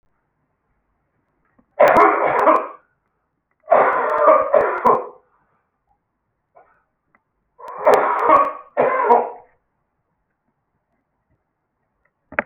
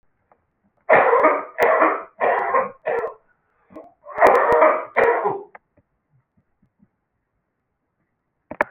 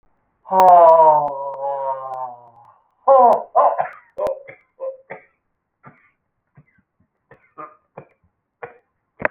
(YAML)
three_cough_length: 12.5 s
three_cough_amplitude: 32768
three_cough_signal_mean_std_ratio: 0.41
cough_length: 8.7 s
cough_amplitude: 29273
cough_signal_mean_std_ratio: 0.46
exhalation_length: 9.3 s
exhalation_amplitude: 29303
exhalation_signal_mean_std_ratio: 0.38
survey_phase: alpha (2021-03-01 to 2021-08-12)
age: 65+
gender: Male
wearing_mask: 'No'
symptom_none: true
symptom_cough_any: true
smoker_status: Never smoked
respiratory_condition_asthma: false
respiratory_condition_other: false
recruitment_source: REACT
submission_delay: 2 days
covid_test_result: Negative
covid_test_method: RT-qPCR